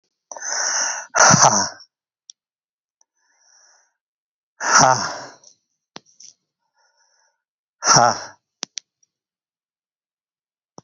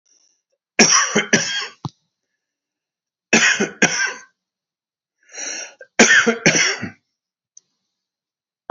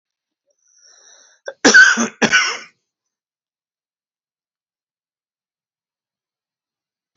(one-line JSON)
{"exhalation_length": "10.8 s", "exhalation_amplitude": 32768, "exhalation_signal_mean_std_ratio": 0.3, "three_cough_length": "8.7 s", "three_cough_amplitude": 32520, "three_cough_signal_mean_std_ratio": 0.39, "cough_length": "7.2 s", "cough_amplitude": 32767, "cough_signal_mean_std_ratio": 0.24, "survey_phase": "beta (2021-08-13 to 2022-03-07)", "age": "65+", "gender": "Male", "wearing_mask": "No", "symptom_runny_or_blocked_nose": true, "symptom_shortness_of_breath": true, "symptom_fatigue": true, "symptom_onset": "12 days", "smoker_status": "Ex-smoker", "respiratory_condition_asthma": false, "respiratory_condition_other": false, "recruitment_source": "REACT", "submission_delay": "2 days", "covid_test_result": "Negative", "covid_test_method": "RT-qPCR"}